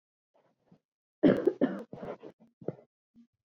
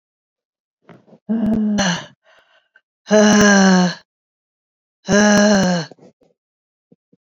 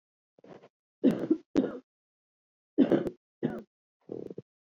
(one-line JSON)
{"cough_length": "3.6 s", "cough_amplitude": 9329, "cough_signal_mean_std_ratio": 0.27, "exhalation_length": "7.3 s", "exhalation_amplitude": 28177, "exhalation_signal_mean_std_ratio": 0.48, "three_cough_length": "4.8 s", "three_cough_amplitude": 9848, "three_cough_signal_mean_std_ratio": 0.32, "survey_phase": "beta (2021-08-13 to 2022-03-07)", "age": "45-64", "gender": "Female", "wearing_mask": "Yes", "symptom_cough_any": true, "symptom_runny_or_blocked_nose": true, "symptom_shortness_of_breath": true, "symptom_sore_throat": true, "symptom_fatigue": true, "symptom_fever_high_temperature": true, "symptom_headache": true, "symptom_change_to_sense_of_smell_or_taste": true, "symptom_other": true, "symptom_onset": "3 days", "smoker_status": "Never smoked", "respiratory_condition_asthma": false, "respiratory_condition_other": false, "recruitment_source": "Test and Trace", "submission_delay": "1 day", "covid_test_result": "Positive", "covid_test_method": "RT-qPCR"}